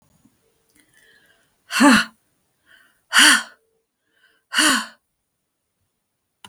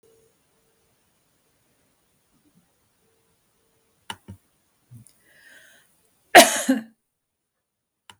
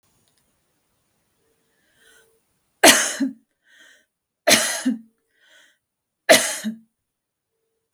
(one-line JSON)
{"exhalation_length": "6.5 s", "exhalation_amplitude": 32766, "exhalation_signal_mean_std_ratio": 0.29, "cough_length": "8.2 s", "cough_amplitude": 32768, "cough_signal_mean_std_ratio": 0.15, "three_cough_length": "7.9 s", "three_cough_amplitude": 32768, "three_cough_signal_mean_std_ratio": 0.26, "survey_phase": "beta (2021-08-13 to 2022-03-07)", "age": "45-64", "gender": "Female", "wearing_mask": "No", "symptom_none": true, "smoker_status": "Never smoked", "respiratory_condition_asthma": true, "respiratory_condition_other": false, "recruitment_source": "REACT", "submission_delay": "2 days", "covid_test_result": "Negative", "covid_test_method": "RT-qPCR", "influenza_a_test_result": "Negative", "influenza_b_test_result": "Negative"}